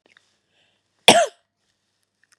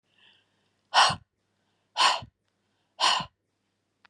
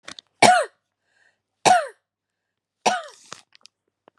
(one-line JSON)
{"cough_length": "2.4 s", "cough_amplitude": 32768, "cough_signal_mean_std_ratio": 0.21, "exhalation_length": "4.1 s", "exhalation_amplitude": 14805, "exhalation_signal_mean_std_ratio": 0.31, "three_cough_length": "4.2 s", "three_cough_amplitude": 32762, "three_cough_signal_mean_std_ratio": 0.29, "survey_phase": "beta (2021-08-13 to 2022-03-07)", "age": "45-64", "gender": "Female", "wearing_mask": "No", "symptom_none": true, "smoker_status": "Never smoked", "respiratory_condition_asthma": false, "respiratory_condition_other": false, "recruitment_source": "REACT", "submission_delay": "1 day", "covid_test_result": "Negative", "covid_test_method": "RT-qPCR", "influenza_a_test_result": "Negative", "influenza_b_test_result": "Negative"}